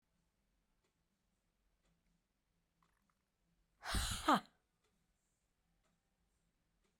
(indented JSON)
{
  "exhalation_length": "7.0 s",
  "exhalation_amplitude": 3000,
  "exhalation_signal_mean_std_ratio": 0.2,
  "survey_phase": "beta (2021-08-13 to 2022-03-07)",
  "age": "45-64",
  "gender": "Female",
  "wearing_mask": "No",
  "symptom_none": true,
  "smoker_status": "Ex-smoker",
  "respiratory_condition_asthma": false,
  "respiratory_condition_other": false,
  "recruitment_source": "REACT",
  "submission_delay": "1 day",
  "covid_test_result": "Negative",
  "covid_test_method": "RT-qPCR"
}